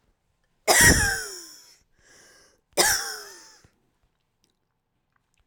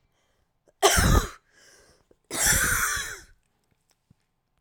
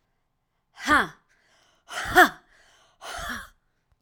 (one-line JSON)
{"three_cough_length": "5.5 s", "three_cough_amplitude": 22382, "three_cough_signal_mean_std_ratio": 0.32, "cough_length": "4.6 s", "cough_amplitude": 22355, "cough_signal_mean_std_ratio": 0.41, "exhalation_length": "4.0 s", "exhalation_amplitude": 25200, "exhalation_signal_mean_std_ratio": 0.29, "survey_phase": "alpha (2021-03-01 to 2021-08-12)", "age": "45-64", "gender": "Female", "wearing_mask": "No", "symptom_abdominal_pain": true, "symptom_diarrhoea": true, "symptom_fatigue": true, "symptom_headache": true, "symptom_onset": "6 days", "smoker_status": "Current smoker (11 or more cigarettes per day)", "respiratory_condition_asthma": false, "respiratory_condition_other": false, "recruitment_source": "REACT", "submission_delay": "2 days", "covid_test_result": "Negative", "covid_test_method": "RT-qPCR"}